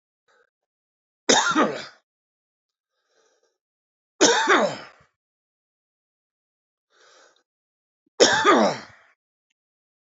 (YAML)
three_cough_length: 10.1 s
three_cough_amplitude: 27427
three_cough_signal_mean_std_ratio: 0.31
survey_phase: beta (2021-08-13 to 2022-03-07)
age: 45-64
gender: Male
wearing_mask: 'No'
symptom_none: true
smoker_status: Current smoker (11 or more cigarettes per day)
respiratory_condition_asthma: true
respiratory_condition_other: true
recruitment_source: REACT
submission_delay: 1 day
covid_test_result: Negative
covid_test_method: RT-qPCR
influenza_a_test_result: Negative
influenza_b_test_result: Negative